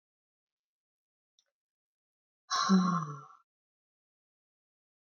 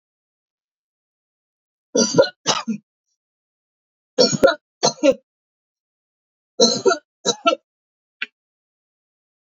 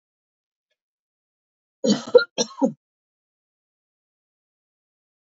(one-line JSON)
{"exhalation_length": "5.1 s", "exhalation_amplitude": 5935, "exhalation_signal_mean_std_ratio": 0.27, "three_cough_length": "9.5 s", "three_cough_amplitude": 29588, "three_cough_signal_mean_std_ratio": 0.3, "cough_length": "5.3 s", "cough_amplitude": 27367, "cough_signal_mean_std_ratio": 0.19, "survey_phase": "alpha (2021-03-01 to 2021-08-12)", "age": "65+", "gender": "Female", "wearing_mask": "No", "symptom_none": true, "smoker_status": "Never smoked", "respiratory_condition_asthma": false, "respiratory_condition_other": false, "recruitment_source": "REACT", "submission_delay": "3 days", "covid_test_result": "Negative", "covid_test_method": "RT-qPCR"}